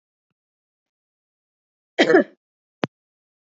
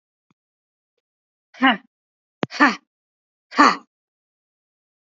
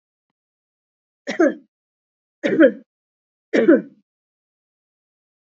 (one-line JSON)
{"cough_length": "3.5 s", "cough_amplitude": 25517, "cough_signal_mean_std_ratio": 0.2, "exhalation_length": "5.1 s", "exhalation_amplitude": 31737, "exhalation_signal_mean_std_ratio": 0.23, "three_cough_length": "5.5 s", "three_cough_amplitude": 26280, "three_cough_signal_mean_std_ratio": 0.28, "survey_phase": "beta (2021-08-13 to 2022-03-07)", "age": "18-44", "gender": "Female", "wearing_mask": "No", "symptom_none": true, "smoker_status": "Never smoked", "respiratory_condition_asthma": false, "respiratory_condition_other": false, "recruitment_source": "REACT", "submission_delay": "2 days", "covid_test_result": "Negative", "covid_test_method": "RT-qPCR", "influenza_a_test_result": "Negative", "influenza_b_test_result": "Negative"}